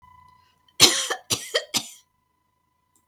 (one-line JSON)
{"cough_length": "3.1 s", "cough_amplitude": 32768, "cough_signal_mean_std_ratio": 0.29, "survey_phase": "beta (2021-08-13 to 2022-03-07)", "age": "65+", "gender": "Female", "wearing_mask": "No", "symptom_none": true, "smoker_status": "Never smoked", "respiratory_condition_asthma": false, "respiratory_condition_other": false, "recruitment_source": "REACT", "submission_delay": "1 day", "covid_test_result": "Negative", "covid_test_method": "RT-qPCR", "influenza_a_test_result": "Negative", "influenza_b_test_result": "Negative"}